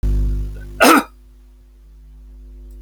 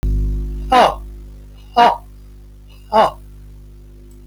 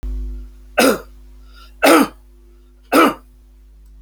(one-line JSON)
{"cough_length": "2.8 s", "cough_amplitude": 32768, "cough_signal_mean_std_ratio": 0.49, "exhalation_length": "4.3 s", "exhalation_amplitude": 30634, "exhalation_signal_mean_std_ratio": 0.52, "three_cough_length": "4.0 s", "three_cough_amplitude": 30310, "three_cough_signal_mean_std_ratio": 0.42, "survey_phase": "beta (2021-08-13 to 2022-03-07)", "age": "65+", "gender": "Male", "wearing_mask": "No", "symptom_none": true, "smoker_status": "Ex-smoker", "respiratory_condition_asthma": false, "respiratory_condition_other": false, "recruitment_source": "REACT", "submission_delay": "1 day", "covid_test_result": "Negative", "covid_test_method": "RT-qPCR"}